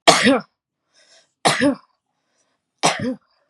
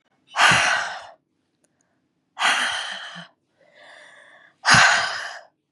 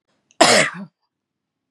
{"three_cough_length": "3.5 s", "three_cough_amplitude": 32768, "three_cough_signal_mean_std_ratio": 0.37, "exhalation_length": "5.7 s", "exhalation_amplitude": 30084, "exhalation_signal_mean_std_ratio": 0.43, "cough_length": "1.7 s", "cough_amplitude": 32768, "cough_signal_mean_std_ratio": 0.34, "survey_phase": "beta (2021-08-13 to 2022-03-07)", "age": "18-44", "gender": "Female", "wearing_mask": "No", "symptom_other": true, "smoker_status": "Never smoked", "respiratory_condition_asthma": false, "respiratory_condition_other": false, "recruitment_source": "REACT", "submission_delay": "1 day", "covid_test_result": "Negative", "covid_test_method": "RT-qPCR", "influenza_a_test_result": "Negative", "influenza_b_test_result": "Negative"}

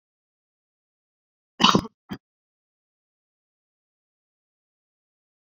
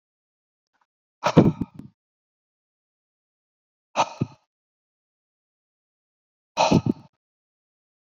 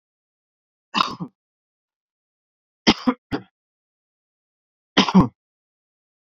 {"cough_length": "5.5 s", "cough_amplitude": 28384, "cough_signal_mean_std_ratio": 0.14, "exhalation_length": "8.2 s", "exhalation_amplitude": 26916, "exhalation_signal_mean_std_ratio": 0.21, "three_cough_length": "6.4 s", "three_cough_amplitude": 28560, "three_cough_signal_mean_std_ratio": 0.22, "survey_phase": "beta (2021-08-13 to 2022-03-07)", "age": "45-64", "gender": "Male", "wearing_mask": "No", "symptom_cough_any": true, "symptom_sore_throat": true, "symptom_abdominal_pain": true, "symptom_fatigue": true, "symptom_onset": "2 days", "smoker_status": "Current smoker (e-cigarettes or vapes only)", "respiratory_condition_asthma": false, "respiratory_condition_other": false, "recruitment_source": "Test and Trace", "submission_delay": "1 day", "covid_test_result": "Positive", "covid_test_method": "ePCR"}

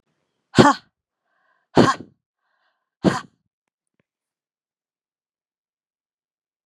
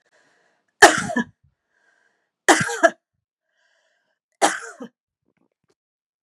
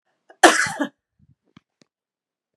{"exhalation_length": "6.7 s", "exhalation_amplitude": 32768, "exhalation_signal_mean_std_ratio": 0.19, "three_cough_length": "6.2 s", "three_cough_amplitude": 32768, "three_cough_signal_mean_std_ratio": 0.24, "cough_length": "2.6 s", "cough_amplitude": 32768, "cough_signal_mean_std_ratio": 0.24, "survey_phase": "beta (2021-08-13 to 2022-03-07)", "age": "45-64", "gender": "Female", "wearing_mask": "No", "symptom_runny_or_blocked_nose": true, "symptom_onset": "3 days", "smoker_status": "Ex-smoker", "respiratory_condition_asthma": false, "respiratory_condition_other": false, "recruitment_source": "Test and Trace", "submission_delay": "2 days", "covid_test_result": "Positive", "covid_test_method": "RT-qPCR", "covid_ct_value": 25.7, "covid_ct_gene": "ORF1ab gene"}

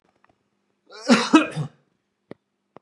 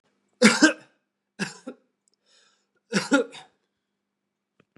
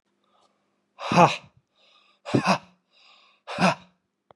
{"cough_length": "2.8 s", "cough_amplitude": 28676, "cough_signal_mean_std_ratio": 0.29, "three_cough_length": "4.8 s", "three_cough_amplitude": 29482, "three_cough_signal_mean_std_ratio": 0.26, "exhalation_length": "4.4 s", "exhalation_amplitude": 23584, "exhalation_signal_mean_std_ratio": 0.3, "survey_phase": "beta (2021-08-13 to 2022-03-07)", "age": "18-44", "gender": "Male", "wearing_mask": "No", "symptom_headache": true, "symptom_change_to_sense_of_smell_or_taste": true, "smoker_status": "Never smoked", "respiratory_condition_asthma": true, "respiratory_condition_other": false, "recruitment_source": "Test and Trace", "submission_delay": "1 day", "covid_test_result": "Positive", "covid_test_method": "RT-qPCR", "covid_ct_value": 30.6, "covid_ct_gene": "ORF1ab gene"}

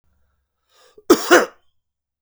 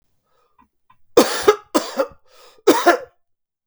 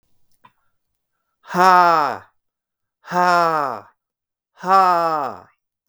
{"cough_length": "2.2 s", "cough_amplitude": 32768, "cough_signal_mean_std_ratio": 0.27, "three_cough_length": "3.7 s", "three_cough_amplitude": 32768, "three_cough_signal_mean_std_ratio": 0.35, "exhalation_length": "5.9 s", "exhalation_amplitude": 32766, "exhalation_signal_mean_std_ratio": 0.4, "survey_phase": "beta (2021-08-13 to 2022-03-07)", "age": "45-64", "gender": "Male", "wearing_mask": "No", "symptom_none": true, "smoker_status": "Never smoked", "respiratory_condition_asthma": false, "respiratory_condition_other": false, "recruitment_source": "REACT", "submission_delay": "3 days", "covid_test_result": "Negative", "covid_test_method": "RT-qPCR", "influenza_a_test_result": "Negative", "influenza_b_test_result": "Negative"}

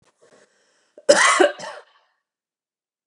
{"cough_length": "3.1 s", "cough_amplitude": 32419, "cough_signal_mean_std_ratio": 0.3, "survey_phase": "beta (2021-08-13 to 2022-03-07)", "age": "45-64", "gender": "Female", "wearing_mask": "No", "symptom_none": true, "smoker_status": "Ex-smoker", "respiratory_condition_asthma": false, "respiratory_condition_other": false, "recruitment_source": "REACT", "submission_delay": "1 day", "covid_test_result": "Negative", "covid_test_method": "RT-qPCR"}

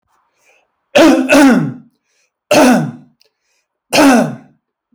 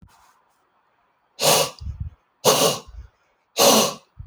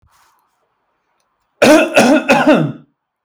{"three_cough_length": "4.9 s", "three_cough_amplitude": 32767, "three_cough_signal_mean_std_ratio": 0.5, "exhalation_length": "4.3 s", "exhalation_amplitude": 29890, "exhalation_signal_mean_std_ratio": 0.41, "cough_length": "3.2 s", "cough_amplitude": 32083, "cough_signal_mean_std_ratio": 0.47, "survey_phase": "alpha (2021-03-01 to 2021-08-12)", "age": "18-44", "gender": "Male", "wearing_mask": "No", "symptom_none": true, "smoker_status": "Ex-smoker", "respiratory_condition_asthma": false, "respiratory_condition_other": false, "recruitment_source": "REACT", "submission_delay": "1 day", "covid_test_result": "Negative", "covid_test_method": "RT-qPCR"}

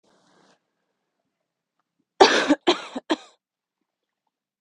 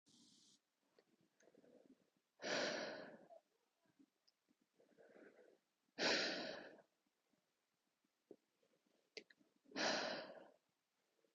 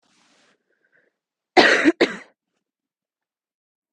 {"three_cough_length": "4.6 s", "three_cough_amplitude": 32768, "three_cough_signal_mean_std_ratio": 0.24, "exhalation_length": "11.3 s", "exhalation_amplitude": 1575, "exhalation_signal_mean_std_ratio": 0.34, "cough_length": "3.9 s", "cough_amplitude": 32768, "cough_signal_mean_std_ratio": 0.25, "survey_phase": "beta (2021-08-13 to 2022-03-07)", "age": "18-44", "gender": "Female", "wearing_mask": "No", "symptom_runny_or_blocked_nose": true, "symptom_fatigue": true, "symptom_onset": "12 days", "smoker_status": "Never smoked", "respiratory_condition_asthma": false, "respiratory_condition_other": false, "recruitment_source": "REACT", "submission_delay": "4 days", "covid_test_result": "Negative", "covid_test_method": "RT-qPCR", "covid_ct_value": 38.7, "covid_ct_gene": "N gene", "influenza_a_test_result": "Negative", "influenza_b_test_result": "Negative"}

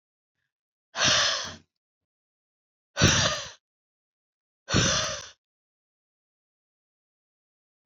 {"exhalation_length": "7.9 s", "exhalation_amplitude": 16144, "exhalation_signal_mean_std_ratio": 0.33, "survey_phase": "alpha (2021-03-01 to 2021-08-12)", "age": "65+", "gender": "Female", "wearing_mask": "No", "symptom_none": true, "smoker_status": "Ex-smoker", "respiratory_condition_asthma": false, "respiratory_condition_other": false, "recruitment_source": "REACT", "submission_delay": "1 day", "covid_test_result": "Negative", "covid_test_method": "RT-qPCR"}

